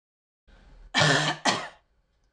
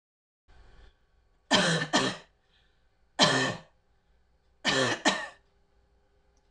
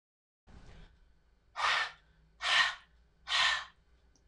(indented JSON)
{
  "cough_length": "2.3 s",
  "cough_amplitude": 13461,
  "cough_signal_mean_std_ratio": 0.42,
  "three_cough_length": "6.5 s",
  "three_cough_amplitude": 15427,
  "three_cough_signal_mean_std_ratio": 0.38,
  "exhalation_length": "4.3 s",
  "exhalation_amplitude": 5843,
  "exhalation_signal_mean_std_ratio": 0.41,
  "survey_phase": "beta (2021-08-13 to 2022-03-07)",
  "age": "18-44",
  "gender": "Female",
  "wearing_mask": "No",
  "symptom_cough_any": true,
  "symptom_runny_or_blocked_nose": true,
  "symptom_sore_throat": true,
  "symptom_change_to_sense_of_smell_or_taste": true,
  "symptom_onset": "2 days",
  "smoker_status": "Never smoked",
  "respiratory_condition_asthma": false,
  "respiratory_condition_other": false,
  "recruitment_source": "REACT",
  "submission_delay": "3 days",
  "covid_test_result": "Negative",
  "covid_test_method": "RT-qPCR",
  "influenza_a_test_result": "Negative",
  "influenza_b_test_result": "Negative"
}